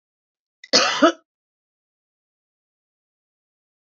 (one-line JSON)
{"cough_length": "3.9 s", "cough_amplitude": 29972, "cough_signal_mean_std_ratio": 0.22, "survey_phase": "beta (2021-08-13 to 2022-03-07)", "age": "45-64", "gender": "Female", "wearing_mask": "No", "symptom_cough_any": true, "symptom_runny_or_blocked_nose": true, "symptom_fever_high_temperature": true, "symptom_other": true, "symptom_onset": "4 days", "smoker_status": "Ex-smoker", "respiratory_condition_asthma": false, "respiratory_condition_other": false, "recruitment_source": "Test and Trace", "submission_delay": "1 day", "covid_test_result": "Positive", "covid_test_method": "RT-qPCR", "covid_ct_value": 22.7, "covid_ct_gene": "ORF1ab gene", "covid_ct_mean": 22.8, "covid_viral_load": "33000 copies/ml", "covid_viral_load_category": "Low viral load (10K-1M copies/ml)"}